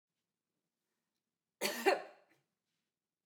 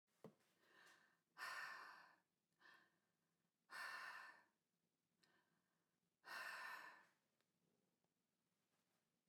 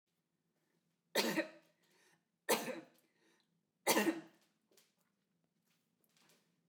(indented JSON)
{
  "cough_length": "3.3 s",
  "cough_amplitude": 5748,
  "cough_signal_mean_std_ratio": 0.23,
  "exhalation_length": "9.3 s",
  "exhalation_amplitude": 260,
  "exhalation_signal_mean_std_ratio": 0.43,
  "three_cough_length": "6.7 s",
  "three_cough_amplitude": 4433,
  "three_cough_signal_mean_std_ratio": 0.28,
  "survey_phase": "beta (2021-08-13 to 2022-03-07)",
  "age": "45-64",
  "gender": "Female",
  "wearing_mask": "No",
  "symptom_none": true,
  "smoker_status": "Ex-smoker",
  "respiratory_condition_asthma": false,
  "respiratory_condition_other": false,
  "recruitment_source": "REACT",
  "submission_delay": "2 days",
  "covid_test_result": "Negative",
  "covid_test_method": "RT-qPCR",
  "influenza_a_test_result": "Negative",
  "influenza_b_test_result": "Negative"
}